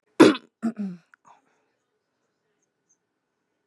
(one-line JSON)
{"cough_length": "3.7 s", "cough_amplitude": 27335, "cough_signal_mean_std_ratio": 0.2, "survey_phase": "beta (2021-08-13 to 2022-03-07)", "age": "18-44", "gender": "Female", "wearing_mask": "No", "symptom_cough_any": true, "symptom_runny_or_blocked_nose": true, "symptom_sore_throat": true, "symptom_onset": "12 days", "smoker_status": "Never smoked", "respiratory_condition_asthma": false, "respiratory_condition_other": false, "recruitment_source": "REACT", "submission_delay": "2 days", "covid_test_result": "Negative", "covid_test_method": "RT-qPCR", "influenza_a_test_result": "Negative", "influenza_b_test_result": "Negative"}